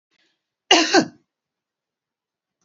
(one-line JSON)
{"cough_length": "2.6 s", "cough_amplitude": 28900, "cough_signal_mean_std_ratio": 0.26, "survey_phase": "alpha (2021-03-01 to 2021-08-12)", "age": "45-64", "gender": "Female", "wearing_mask": "No", "symptom_none": true, "smoker_status": "Never smoked", "respiratory_condition_asthma": false, "respiratory_condition_other": false, "recruitment_source": "REACT", "submission_delay": "2 days", "covid_test_result": "Negative", "covid_test_method": "RT-qPCR"}